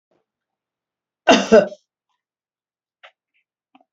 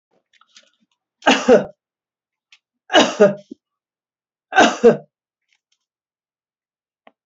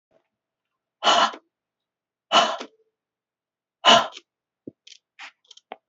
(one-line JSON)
{"cough_length": "3.9 s", "cough_amplitude": 32768, "cough_signal_mean_std_ratio": 0.22, "three_cough_length": "7.3 s", "three_cough_amplitude": 32768, "three_cough_signal_mean_std_ratio": 0.28, "exhalation_length": "5.9 s", "exhalation_amplitude": 27837, "exhalation_signal_mean_std_ratio": 0.27, "survey_phase": "alpha (2021-03-01 to 2021-08-12)", "age": "45-64", "gender": "Female", "wearing_mask": "No", "symptom_none": true, "smoker_status": "Never smoked", "respiratory_condition_asthma": false, "respiratory_condition_other": false, "recruitment_source": "REACT", "submission_delay": "7 days", "covid_test_result": "Negative", "covid_test_method": "RT-qPCR"}